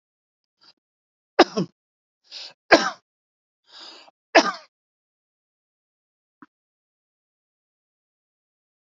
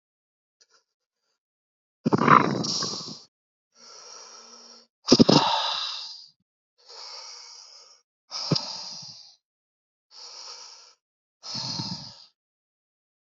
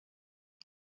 three_cough_length: 9.0 s
three_cough_amplitude: 32767
three_cough_signal_mean_std_ratio: 0.16
exhalation_length: 13.3 s
exhalation_amplitude: 29098
exhalation_signal_mean_std_ratio: 0.3
cough_length: 0.9 s
cough_amplitude: 568
cough_signal_mean_std_ratio: 0.06
survey_phase: alpha (2021-03-01 to 2021-08-12)
age: 45-64
gender: Male
wearing_mask: 'No'
symptom_none: true
smoker_status: Current smoker (e-cigarettes or vapes only)
respiratory_condition_asthma: false
respiratory_condition_other: false
recruitment_source: REACT
submission_delay: 2 days
covid_test_result: Negative
covid_test_method: RT-qPCR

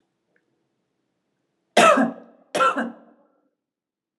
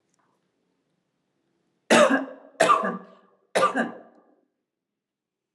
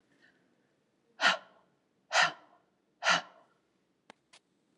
cough_length: 4.2 s
cough_amplitude: 26624
cough_signal_mean_std_ratio: 0.31
three_cough_length: 5.5 s
three_cough_amplitude: 19242
three_cough_signal_mean_std_ratio: 0.33
exhalation_length: 4.8 s
exhalation_amplitude: 8818
exhalation_signal_mean_std_ratio: 0.26
survey_phase: alpha (2021-03-01 to 2021-08-12)
age: 45-64
gender: Female
wearing_mask: 'Yes'
symptom_none: true
smoker_status: Never smoked
respiratory_condition_asthma: false
respiratory_condition_other: false
recruitment_source: Test and Trace
submission_delay: 0 days
covid_test_result: Negative
covid_test_method: LFT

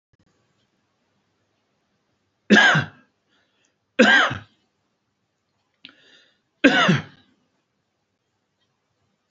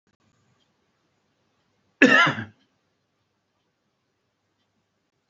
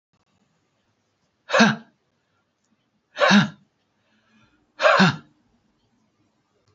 three_cough_length: 9.3 s
three_cough_amplitude: 29508
three_cough_signal_mean_std_ratio: 0.27
cough_length: 5.3 s
cough_amplitude: 26829
cough_signal_mean_std_ratio: 0.2
exhalation_length: 6.7 s
exhalation_amplitude: 24989
exhalation_signal_mean_std_ratio: 0.29
survey_phase: beta (2021-08-13 to 2022-03-07)
age: 65+
gender: Male
wearing_mask: 'No'
symptom_none: true
smoker_status: Never smoked
respiratory_condition_asthma: false
respiratory_condition_other: false
recruitment_source: REACT
submission_delay: 3 days
covid_test_result: Negative
covid_test_method: RT-qPCR
influenza_a_test_result: Unknown/Void
influenza_b_test_result: Unknown/Void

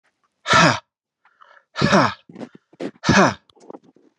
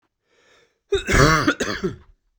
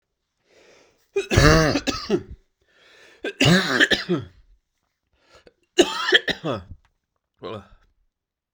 exhalation_length: 4.2 s
exhalation_amplitude: 31491
exhalation_signal_mean_std_ratio: 0.38
cough_length: 2.4 s
cough_amplitude: 31264
cough_signal_mean_std_ratio: 0.45
three_cough_length: 8.5 s
three_cough_amplitude: 32767
three_cough_signal_mean_std_ratio: 0.38
survey_phase: beta (2021-08-13 to 2022-03-07)
age: 18-44
gender: Male
wearing_mask: 'No'
symptom_runny_or_blocked_nose: true
symptom_sore_throat: true
symptom_fatigue: true
symptom_change_to_sense_of_smell_or_taste: true
symptom_loss_of_taste: true
smoker_status: Ex-smoker
respiratory_condition_asthma: false
respiratory_condition_other: false
recruitment_source: Test and Trace
submission_delay: 2 days
covid_test_result: Positive
covid_test_method: RT-qPCR
covid_ct_value: 14.5
covid_ct_gene: N gene
covid_ct_mean: 14.7
covid_viral_load: 15000000 copies/ml
covid_viral_load_category: High viral load (>1M copies/ml)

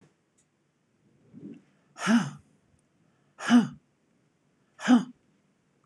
exhalation_length: 5.9 s
exhalation_amplitude: 12534
exhalation_signal_mean_std_ratio: 0.27
survey_phase: beta (2021-08-13 to 2022-03-07)
age: 45-64
gender: Female
wearing_mask: 'No'
symptom_none: true
smoker_status: Never smoked
respiratory_condition_asthma: false
respiratory_condition_other: false
recruitment_source: REACT
submission_delay: 1 day
covid_test_result: Negative
covid_test_method: RT-qPCR
influenza_a_test_result: Negative
influenza_b_test_result: Negative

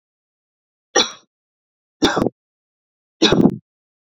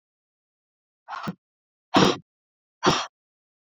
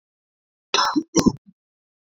three_cough_length: 4.2 s
three_cough_amplitude: 32768
three_cough_signal_mean_std_ratio: 0.3
exhalation_length: 3.8 s
exhalation_amplitude: 26350
exhalation_signal_mean_std_ratio: 0.27
cough_length: 2.0 s
cough_amplitude: 25066
cough_signal_mean_std_ratio: 0.33
survey_phase: beta (2021-08-13 to 2022-03-07)
age: 18-44
gender: Female
wearing_mask: 'No'
symptom_runny_or_blocked_nose: true
symptom_onset: 13 days
smoker_status: Current smoker (1 to 10 cigarettes per day)
respiratory_condition_asthma: false
respiratory_condition_other: false
recruitment_source: REACT
submission_delay: 1 day
covid_test_result: Negative
covid_test_method: RT-qPCR
influenza_a_test_result: Negative
influenza_b_test_result: Negative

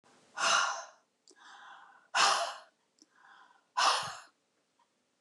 exhalation_length: 5.2 s
exhalation_amplitude: 7326
exhalation_signal_mean_std_ratio: 0.39
survey_phase: beta (2021-08-13 to 2022-03-07)
age: 65+
gender: Female
wearing_mask: 'No'
symptom_runny_or_blocked_nose: true
smoker_status: Never smoked
respiratory_condition_asthma: false
respiratory_condition_other: false
recruitment_source: Test and Trace
submission_delay: 1 day
covid_test_result: Negative
covid_test_method: LFT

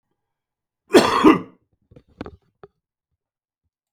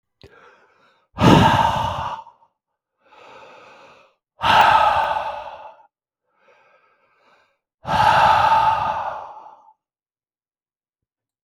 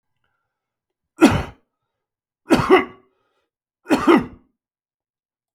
cough_length: 3.9 s
cough_amplitude: 32768
cough_signal_mean_std_ratio: 0.25
exhalation_length: 11.4 s
exhalation_amplitude: 32766
exhalation_signal_mean_std_ratio: 0.43
three_cough_length: 5.5 s
three_cough_amplitude: 32766
three_cough_signal_mean_std_ratio: 0.29
survey_phase: beta (2021-08-13 to 2022-03-07)
age: 65+
gender: Male
wearing_mask: 'No'
symptom_cough_any: true
symptom_headache: true
symptom_onset: 5 days
smoker_status: Never smoked
respiratory_condition_asthma: false
respiratory_condition_other: false
recruitment_source: Test and Trace
submission_delay: 2 days
covid_test_result: Positive
covid_test_method: LAMP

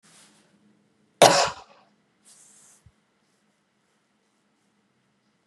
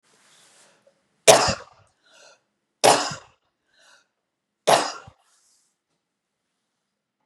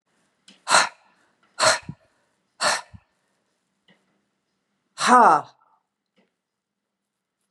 cough_length: 5.5 s
cough_amplitude: 32767
cough_signal_mean_std_ratio: 0.18
three_cough_length: 7.3 s
three_cough_amplitude: 32767
three_cough_signal_mean_std_ratio: 0.23
exhalation_length: 7.5 s
exhalation_amplitude: 28597
exhalation_signal_mean_std_ratio: 0.27
survey_phase: beta (2021-08-13 to 2022-03-07)
age: 45-64
gender: Female
wearing_mask: 'No'
symptom_cough_any: true
symptom_onset: 8 days
smoker_status: Ex-smoker
respiratory_condition_asthma: false
respiratory_condition_other: false
recruitment_source: Test and Trace
submission_delay: 2 days
covid_test_result: Positive
covid_test_method: RT-qPCR
covid_ct_value: 21.8
covid_ct_gene: ORF1ab gene
covid_ct_mean: 22.4
covid_viral_load: 44000 copies/ml
covid_viral_load_category: Low viral load (10K-1M copies/ml)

